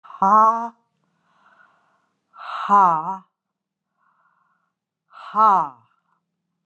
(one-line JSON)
{"exhalation_length": "6.7 s", "exhalation_amplitude": 21297, "exhalation_signal_mean_std_ratio": 0.34, "survey_phase": "beta (2021-08-13 to 2022-03-07)", "age": "65+", "gender": "Female", "wearing_mask": "No", "symptom_none": true, "symptom_onset": "13 days", "smoker_status": "Never smoked", "respiratory_condition_asthma": false, "respiratory_condition_other": false, "recruitment_source": "REACT", "submission_delay": "1 day", "covid_test_result": "Negative", "covid_test_method": "RT-qPCR"}